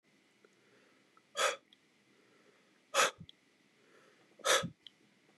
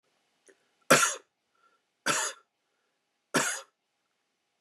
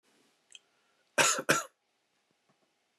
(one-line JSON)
{"exhalation_length": "5.4 s", "exhalation_amplitude": 6101, "exhalation_signal_mean_std_ratio": 0.27, "three_cough_length": "4.6 s", "three_cough_amplitude": 16966, "three_cough_signal_mean_std_ratio": 0.28, "cough_length": "3.0 s", "cough_amplitude": 10110, "cough_signal_mean_std_ratio": 0.27, "survey_phase": "beta (2021-08-13 to 2022-03-07)", "age": "18-44", "gender": "Male", "wearing_mask": "No", "symptom_runny_or_blocked_nose": true, "symptom_onset": "9 days", "smoker_status": "Never smoked", "respiratory_condition_asthma": false, "respiratory_condition_other": false, "recruitment_source": "REACT", "submission_delay": "1 day", "covid_test_result": "Negative", "covid_test_method": "RT-qPCR", "influenza_a_test_result": "Unknown/Void", "influenza_b_test_result": "Unknown/Void"}